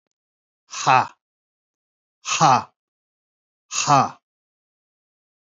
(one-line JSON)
{"exhalation_length": "5.5 s", "exhalation_amplitude": 24915, "exhalation_signal_mean_std_ratio": 0.3, "survey_phase": "beta (2021-08-13 to 2022-03-07)", "age": "45-64", "gender": "Male", "wearing_mask": "No", "symptom_cough_any": true, "symptom_runny_or_blocked_nose": true, "symptom_shortness_of_breath": true, "symptom_sore_throat": true, "symptom_fatigue": true, "symptom_fever_high_temperature": true, "symptom_headache": true, "symptom_change_to_sense_of_smell_or_taste": true, "smoker_status": "Never smoked", "respiratory_condition_asthma": false, "respiratory_condition_other": false, "recruitment_source": "Test and Trace", "submission_delay": "3 days", "covid_test_result": "Negative", "covid_test_method": "RT-qPCR"}